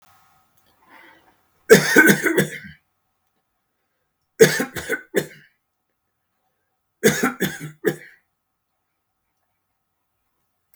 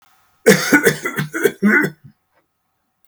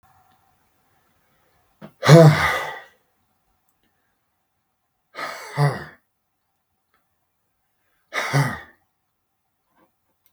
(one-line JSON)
{"three_cough_length": "10.8 s", "three_cough_amplitude": 32768, "three_cough_signal_mean_std_ratio": 0.27, "cough_length": "3.1 s", "cough_amplitude": 32768, "cough_signal_mean_std_ratio": 0.45, "exhalation_length": "10.3 s", "exhalation_amplitude": 32768, "exhalation_signal_mean_std_ratio": 0.24, "survey_phase": "beta (2021-08-13 to 2022-03-07)", "age": "65+", "gender": "Male", "wearing_mask": "No", "symptom_none": true, "smoker_status": "Never smoked", "respiratory_condition_asthma": false, "respiratory_condition_other": false, "recruitment_source": "REACT", "submission_delay": "1 day", "covid_test_result": "Negative", "covid_test_method": "RT-qPCR", "influenza_a_test_result": "Negative", "influenza_b_test_result": "Negative"}